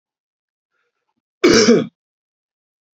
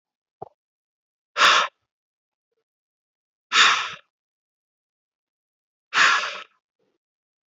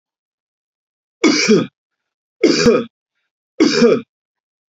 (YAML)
cough_length: 3.0 s
cough_amplitude: 32656
cough_signal_mean_std_ratio: 0.3
exhalation_length: 7.5 s
exhalation_amplitude: 23808
exhalation_signal_mean_std_ratio: 0.28
three_cough_length: 4.7 s
three_cough_amplitude: 30527
three_cough_signal_mean_std_ratio: 0.42
survey_phase: beta (2021-08-13 to 2022-03-07)
age: 18-44
gender: Male
wearing_mask: 'No'
symptom_new_continuous_cough: true
symptom_runny_or_blocked_nose: true
symptom_shortness_of_breath: true
symptom_sore_throat: true
symptom_fatigue: true
symptom_headache: true
symptom_onset: 4 days
smoker_status: Never smoked
respiratory_condition_asthma: false
respiratory_condition_other: false
recruitment_source: Test and Trace
submission_delay: 1 day
covid_test_result: Positive
covid_test_method: RT-qPCR
covid_ct_value: 17.3
covid_ct_gene: N gene
covid_ct_mean: 18.3
covid_viral_load: 1000000 copies/ml
covid_viral_load_category: High viral load (>1M copies/ml)